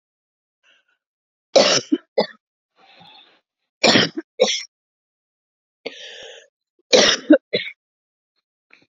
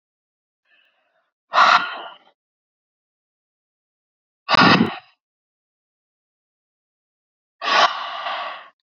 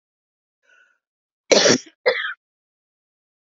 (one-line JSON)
{"three_cough_length": "9.0 s", "three_cough_amplitude": 32768, "three_cough_signal_mean_std_ratio": 0.29, "exhalation_length": "9.0 s", "exhalation_amplitude": 28771, "exhalation_signal_mean_std_ratio": 0.3, "cough_length": "3.6 s", "cough_amplitude": 28356, "cough_signal_mean_std_ratio": 0.27, "survey_phase": "beta (2021-08-13 to 2022-03-07)", "age": "45-64", "gender": "Female", "wearing_mask": "No", "symptom_cough_any": true, "symptom_runny_or_blocked_nose": true, "symptom_fatigue": true, "symptom_other": true, "symptom_onset": "2 days", "smoker_status": "Ex-smoker", "respiratory_condition_asthma": false, "respiratory_condition_other": false, "recruitment_source": "Test and Trace", "submission_delay": "1 day", "covid_test_result": "Positive", "covid_test_method": "RT-qPCR", "covid_ct_value": 31.2, "covid_ct_gene": "ORF1ab gene"}